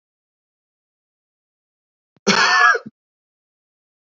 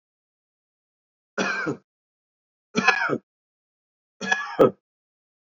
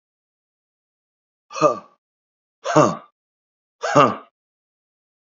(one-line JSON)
{"cough_length": "4.2 s", "cough_amplitude": 28525, "cough_signal_mean_std_ratio": 0.28, "three_cough_length": "5.5 s", "three_cough_amplitude": 24715, "three_cough_signal_mean_std_ratio": 0.31, "exhalation_length": "5.2 s", "exhalation_amplitude": 28381, "exhalation_signal_mean_std_ratio": 0.27, "survey_phase": "beta (2021-08-13 to 2022-03-07)", "age": "65+", "gender": "Male", "wearing_mask": "No", "symptom_cough_any": true, "symptom_runny_or_blocked_nose": true, "symptom_sore_throat": true, "smoker_status": "Ex-smoker", "respiratory_condition_asthma": false, "respiratory_condition_other": false, "recruitment_source": "Test and Trace", "submission_delay": "2 days", "covid_test_result": "Positive", "covid_test_method": "RT-qPCR"}